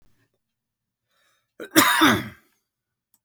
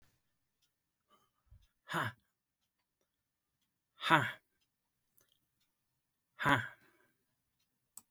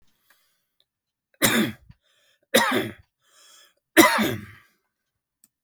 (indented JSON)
{
  "cough_length": "3.2 s",
  "cough_amplitude": 28614,
  "cough_signal_mean_std_ratio": 0.3,
  "exhalation_length": "8.1 s",
  "exhalation_amplitude": 11093,
  "exhalation_signal_mean_std_ratio": 0.21,
  "three_cough_length": "5.6 s",
  "three_cough_amplitude": 31870,
  "three_cough_signal_mean_std_ratio": 0.32,
  "survey_phase": "beta (2021-08-13 to 2022-03-07)",
  "age": "45-64",
  "gender": "Male",
  "wearing_mask": "No",
  "symptom_none": true,
  "smoker_status": "Never smoked",
  "respiratory_condition_asthma": false,
  "respiratory_condition_other": false,
  "recruitment_source": "REACT",
  "submission_delay": "0 days",
  "covid_test_result": "Negative",
  "covid_test_method": "RT-qPCR",
  "influenza_a_test_result": "Negative",
  "influenza_b_test_result": "Negative"
}